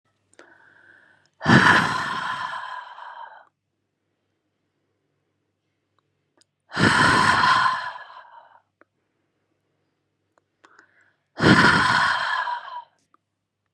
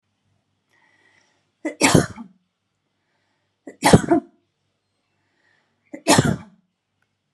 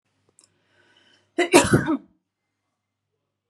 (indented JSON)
{
  "exhalation_length": "13.7 s",
  "exhalation_amplitude": 30489,
  "exhalation_signal_mean_std_ratio": 0.4,
  "three_cough_length": "7.3 s",
  "three_cough_amplitude": 32768,
  "three_cough_signal_mean_std_ratio": 0.26,
  "cough_length": "3.5 s",
  "cough_amplitude": 32336,
  "cough_signal_mean_std_ratio": 0.27,
  "survey_phase": "beta (2021-08-13 to 2022-03-07)",
  "age": "18-44",
  "gender": "Female",
  "wearing_mask": "No",
  "symptom_none": true,
  "smoker_status": "Never smoked",
  "respiratory_condition_asthma": false,
  "respiratory_condition_other": false,
  "recruitment_source": "REACT",
  "submission_delay": "1 day",
  "covid_test_result": "Negative",
  "covid_test_method": "RT-qPCR"
}